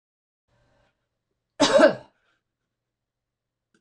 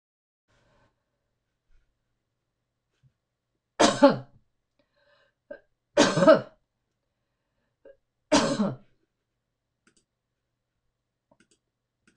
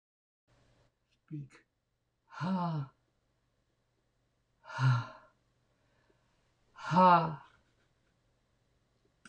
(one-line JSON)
{"cough_length": "3.8 s", "cough_amplitude": 24248, "cough_signal_mean_std_ratio": 0.23, "three_cough_length": "12.2 s", "three_cough_amplitude": 18577, "three_cough_signal_mean_std_ratio": 0.22, "exhalation_length": "9.3 s", "exhalation_amplitude": 8192, "exhalation_signal_mean_std_ratio": 0.28, "survey_phase": "beta (2021-08-13 to 2022-03-07)", "age": "65+", "gender": "Female", "wearing_mask": "No", "symptom_none": true, "smoker_status": "Never smoked", "respiratory_condition_asthma": false, "respiratory_condition_other": false, "recruitment_source": "REACT", "submission_delay": "4 days", "covid_test_result": "Negative", "covid_test_method": "RT-qPCR", "influenza_a_test_result": "Negative", "influenza_b_test_result": "Negative"}